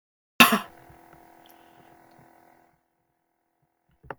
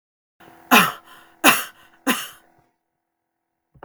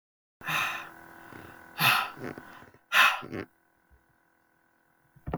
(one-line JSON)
{"cough_length": "4.2 s", "cough_amplitude": 32768, "cough_signal_mean_std_ratio": 0.17, "three_cough_length": "3.8 s", "three_cough_amplitude": 32768, "three_cough_signal_mean_std_ratio": 0.28, "exhalation_length": "5.4 s", "exhalation_amplitude": 13290, "exhalation_signal_mean_std_ratio": 0.37, "survey_phase": "beta (2021-08-13 to 2022-03-07)", "age": "18-44", "gender": "Female", "wearing_mask": "No", "symptom_none": true, "smoker_status": "Never smoked", "respiratory_condition_asthma": false, "respiratory_condition_other": false, "recruitment_source": "REACT", "submission_delay": "1 day", "covid_test_result": "Negative", "covid_test_method": "RT-qPCR"}